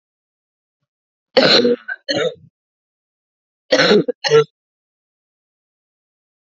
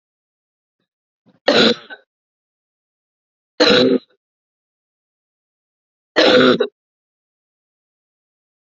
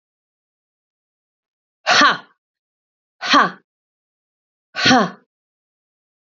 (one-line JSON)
{"cough_length": "6.5 s", "cough_amplitude": 31808, "cough_signal_mean_std_ratio": 0.34, "three_cough_length": "8.7 s", "three_cough_amplitude": 31057, "three_cough_signal_mean_std_ratio": 0.29, "exhalation_length": "6.2 s", "exhalation_amplitude": 30251, "exhalation_signal_mean_std_ratio": 0.28, "survey_phase": "alpha (2021-03-01 to 2021-08-12)", "age": "45-64", "gender": "Female", "wearing_mask": "No", "symptom_cough_any": true, "symptom_headache": true, "smoker_status": "Never smoked", "respiratory_condition_asthma": false, "respiratory_condition_other": false, "recruitment_source": "Test and Trace", "submission_delay": "2 days", "covid_test_result": "Positive", "covid_test_method": "RT-qPCR", "covid_ct_value": 15.0, "covid_ct_gene": "ORF1ab gene", "covid_ct_mean": 15.6, "covid_viral_load": "7500000 copies/ml", "covid_viral_load_category": "High viral load (>1M copies/ml)"}